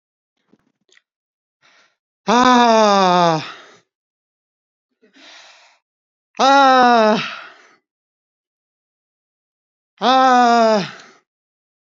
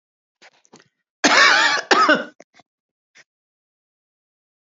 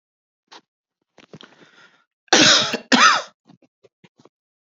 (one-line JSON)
{"exhalation_length": "11.9 s", "exhalation_amplitude": 28961, "exhalation_signal_mean_std_ratio": 0.38, "cough_length": "4.8 s", "cough_amplitude": 32768, "cough_signal_mean_std_ratio": 0.35, "three_cough_length": "4.6 s", "three_cough_amplitude": 32299, "three_cough_signal_mean_std_ratio": 0.32, "survey_phase": "beta (2021-08-13 to 2022-03-07)", "age": "45-64", "gender": "Female", "wearing_mask": "No", "symptom_none": true, "smoker_status": "Ex-smoker", "respiratory_condition_asthma": false, "respiratory_condition_other": false, "recruitment_source": "REACT", "submission_delay": "2 days", "covid_test_result": "Negative", "covid_test_method": "RT-qPCR", "influenza_a_test_result": "Negative", "influenza_b_test_result": "Negative"}